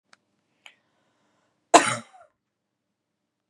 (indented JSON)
{
  "cough_length": "3.5 s",
  "cough_amplitude": 32691,
  "cough_signal_mean_std_ratio": 0.16,
  "survey_phase": "beta (2021-08-13 to 2022-03-07)",
  "age": "18-44",
  "gender": "Female",
  "wearing_mask": "No",
  "symptom_none": true,
  "symptom_onset": "13 days",
  "smoker_status": "Never smoked",
  "respiratory_condition_asthma": false,
  "respiratory_condition_other": false,
  "recruitment_source": "REACT",
  "submission_delay": "3 days",
  "covid_test_result": "Negative",
  "covid_test_method": "RT-qPCR",
  "influenza_a_test_result": "Negative",
  "influenza_b_test_result": "Negative"
}